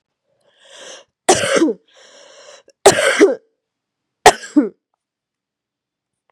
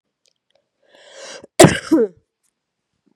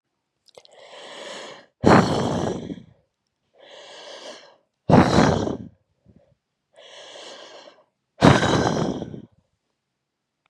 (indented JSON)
{
  "three_cough_length": "6.3 s",
  "three_cough_amplitude": 32768,
  "three_cough_signal_mean_std_ratio": 0.31,
  "cough_length": "3.2 s",
  "cough_amplitude": 32768,
  "cough_signal_mean_std_ratio": 0.25,
  "exhalation_length": "10.5 s",
  "exhalation_amplitude": 32767,
  "exhalation_signal_mean_std_ratio": 0.36,
  "survey_phase": "beta (2021-08-13 to 2022-03-07)",
  "age": "18-44",
  "gender": "Female",
  "wearing_mask": "No",
  "symptom_cough_any": true,
  "symptom_fatigue": true,
  "symptom_headache": true,
  "symptom_other": true,
  "smoker_status": "Current smoker (11 or more cigarettes per day)",
  "respiratory_condition_asthma": false,
  "respiratory_condition_other": false,
  "recruitment_source": "Test and Trace",
  "submission_delay": "1 day",
  "covid_test_result": "Positive",
  "covid_test_method": "RT-qPCR",
  "covid_ct_value": 24.6,
  "covid_ct_gene": "ORF1ab gene",
  "covid_ct_mean": 25.4,
  "covid_viral_load": "4800 copies/ml",
  "covid_viral_load_category": "Minimal viral load (< 10K copies/ml)"
}